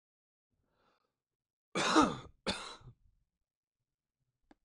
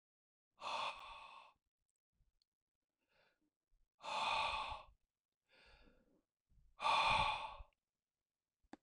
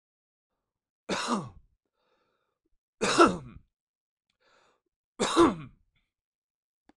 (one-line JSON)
{"cough_length": "4.6 s", "cough_amplitude": 6551, "cough_signal_mean_std_ratio": 0.26, "exhalation_length": "8.8 s", "exhalation_amplitude": 2173, "exhalation_signal_mean_std_ratio": 0.37, "three_cough_length": "7.0 s", "three_cough_amplitude": 16295, "three_cough_signal_mean_std_ratio": 0.27, "survey_phase": "beta (2021-08-13 to 2022-03-07)", "age": "45-64", "gender": "Male", "wearing_mask": "No", "symptom_none": true, "smoker_status": "Never smoked", "respiratory_condition_asthma": false, "respiratory_condition_other": false, "recruitment_source": "REACT", "submission_delay": "0 days", "covid_test_result": "Negative", "covid_test_method": "RT-qPCR"}